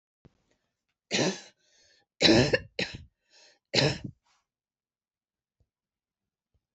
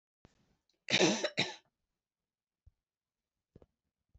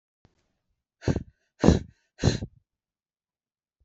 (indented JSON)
{
  "three_cough_length": "6.7 s",
  "three_cough_amplitude": 14028,
  "three_cough_signal_mean_std_ratio": 0.28,
  "cough_length": "4.2 s",
  "cough_amplitude": 6637,
  "cough_signal_mean_std_ratio": 0.26,
  "exhalation_length": "3.8 s",
  "exhalation_amplitude": 24021,
  "exhalation_signal_mean_std_ratio": 0.24,
  "survey_phase": "beta (2021-08-13 to 2022-03-07)",
  "age": "45-64",
  "gender": "Female",
  "wearing_mask": "No",
  "symptom_cough_any": true,
  "symptom_onset": "4 days",
  "smoker_status": "Never smoked",
  "respiratory_condition_asthma": false,
  "respiratory_condition_other": false,
  "recruitment_source": "Test and Trace",
  "submission_delay": "2 days",
  "covid_test_result": "Positive",
  "covid_test_method": "RT-qPCR",
  "covid_ct_value": 24.6,
  "covid_ct_gene": "N gene"
}